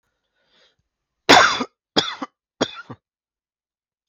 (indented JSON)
{
  "three_cough_length": "4.1 s",
  "three_cough_amplitude": 32768,
  "three_cough_signal_mean_std_ratio": 0.26,
  "survey_phase": "beta (2021-08-13 to 2022-03-07)",
  "age": "45-64",
  "gender": "Male",
  "wearing_mask": "No",
  "symptom_none": true,
  "smoker_status": "Never smoked",
  "respiratory_condition_asthma": false,
  "respiratory_condition_other": false,
  "recruitment_source": "Test and Trace",
  "submission_delay": "0 days",
  "covid_test_result": "Negative",
  "covid_test_method": "LFT"
}